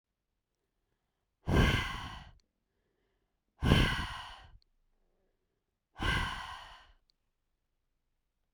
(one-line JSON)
{"exhalation_length": "8.5 s", "exhalation_amplitude": 12062, "exhalation_signal_mean_std_ratio": 0.33, "survey_phase": "beta (2021-08-13 to 2022-03-07)", "age": "18-44", "gender": "Female", "wearing_mask": "No", "symptom_none": true, "smoker_status": "Never smoked", "respiratory_condition_asthma": false, "respiratory_condition_other": false, "recruitment_source": "REACT", "submission_delay": "2 days", "covid_test_result": "Negative", "covid_test_method": "RT-qPCR"}